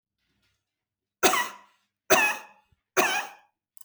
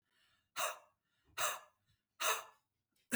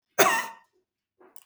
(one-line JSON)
{"three_cough_length": "3.8 s", "three_cough_amplitude": 27065, "three_cough_signal_mean_std_ratio": 0.35, "exhalation_length": "3.2 s", "exhalation_amplitude": 3553, "exhalation_signal_mean_std_ratio": 0.36, "cough_length": "1.5 s", "cough_amplitude": 23934, "cough_signal_mean_std_ratio": 0.33, "survey_phase": "beta (2021-08-13 to 2022-03-07)", "age": "45-64", "gender": "Female", "wearing_mask": "No", "symptom_none": true, "smoker_status": "Never smoked", "recruitment_source": "REACT", "submission_delay": "1 day", "covid_test_result": "Negative", "covid_test_method": "RT-qPCR", "influenza_a_test_result": "Unknown/Void", "influenza_b_test_result": "Unknown/Void"}